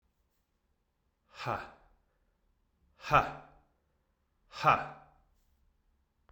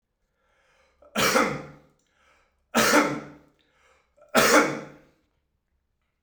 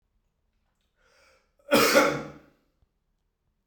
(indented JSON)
{
  "exhalation_length": "6.3 s",
  "exhalation_amplitude": 9934,
  "exhalation_signal_mean_std_ratio": 0.23,
  "three_cough_length": "6.2 s",
  "three_cough_amplitude": 19055,
  "three_cough_signal_mean_std_ratio": 0.36,
  "cough_length": "3.7 s",
  "cough_amplitude": 18328,
  "cough_signal_mean_std_ratio": 0.3,
  "survey_phase": "beta (2021-08-13 to 2022-03-07)",
  "age": "18-44",
  "gender": "Male",
  "wearing_mask": "No",
  "symptom_cough_any": true,
  "symptom_new_continuous_cough": true,
  "symptom_runny_or_blocked_nose": true,
  "symptom_fatigue": true,
  "symptom_fever_high_temperature": true,
  "symptom_headache": true,
  "smoker_status": "Never smoked",
  "respiratory_condition_asthma": false,
  "respiratory_condition_other": false,
  "recruitment_source": "Test and Trace",
  "submission_delay": "1 day",
  "covid_test_result": "Positive",
  "covid_test_method": "RT-qPCR",
  "covid_ct_value": 16.2,
  "covid_ct_gene": "ORF1ab gene",
  "covid_ct_mean": 16.6,
  "covid_viral_load": "3500000 copies/ml",
  "covid_viral_load_category": "High viral load (>1M copies/ml)"
}